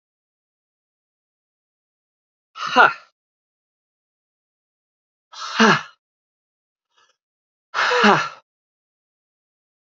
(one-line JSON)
{"exhalation_length": "9.8 s", "exhalation_amplitude": 28381, "exhalation_signal_mean_std_ratio": 0.24, "survey_phase": "alpha (2021-03-01 to 2021-08-12)", "age": "18-44", "gender": "Male", "wearing_mask": "No", "symptom_cough_any": true, "symptom_new_continuous_cough": true, "symptom_onset": "2 days", "smoker_status": "Never smoked", "respiratory_condition_asthma": false, "respiratory_condition_other": false, "recruitment_source": "Test and Trace", "submission_delay": "1 day", "covid_test_result": "Positive", "covid_test_method": "RT-qPCR", "covid_ct_value": 28.7, "covid_ct_gene": "N gene"}